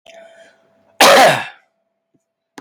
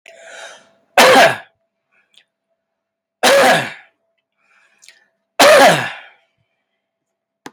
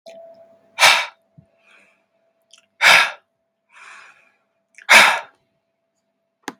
cough_length: 2.6 s
cough_amplitude: 32768
cough_signal_mean_std_ratio: 0.35
three_cough_length: 7.5 s
three_cough_amplitude: 32768
three_cough_signal_mean_std_ratio: 0.35
exhalation_length: 6.6 s
exhalation_amplitude: 32768
exhalation_signal_mean_std_ratio: 0.28
survey_phase: beta (2021-08-13 to 2022-03-07)
age: 18-44
gender: Male
wearing_mask: 'No'
symptom_shortness_of_breath: true
symptom_change_to_sense_of_smell_or_taste: true
smoker_status: Never smoked
respiratory_condition_asthma: true
respiratory_condition_other: false
recruitment_source: REACT
submission_delay: 5 days
covid_test_result: Negative
covid_test_method: RT-qPCR
influenza_a_test_result: Negative
influenza_b_test_result: Negative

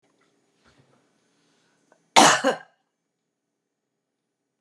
cough_length: 4.6 s
cough_amplitude: 32288
cough_signal_mean_std_ratio: 0.2
survey_phase: beta (2021-08-13 to 2022-03-07)
age: 65+
gender: Female
wearing_mask: 'No'
symptom_cough_any: true
smoker_status: Never smoked
respiratory_condition_asthma: false
respiratory_condition_other: false
recruitment_source: Test and Trace
submission_delay: 1 day
covid_test_result: Positive
covid_test_method: RT-qPCR
covid_ct_value: 22.7
covid_ct_gene: ORF1ab gene
covid_ct_mean: 23.5
covid_viral_load: 20000 copies/ml
covid_viral_load_category: Low viral load (10K-1M copies/ml)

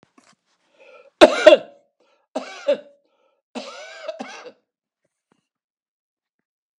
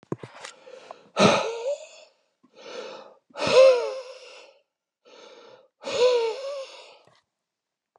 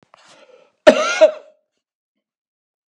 three_cough_length: 6.8 s
three_cough_amplitude: 32768
three_cough_signal_mean_std_ratio: 0.2
exhalation_length: 8.0 s
exhalation_amplitude: 19575
exhalation_signal_mean_std_ratio: 0.38
cough_length: 2.9 s
cough_amplitude: 32768
cough_signal_mean_std_ratio: 0.26
survey_phase: beta (2021-08-13 to 2022-03-07)
age: 65+
gender: Male
wearing_mask: 'No'
symptom_none: true
smoker_status: Never smoked
respiratory_condition_asthma: false
respiratory_condition_other: false
recruitment_source: REACT
submission_delay: 7 days
covid_test_result: Negative
covid_test_method: RT-qPCR
influenza_a_test_result: Negative
influenza_b_test_result: Negative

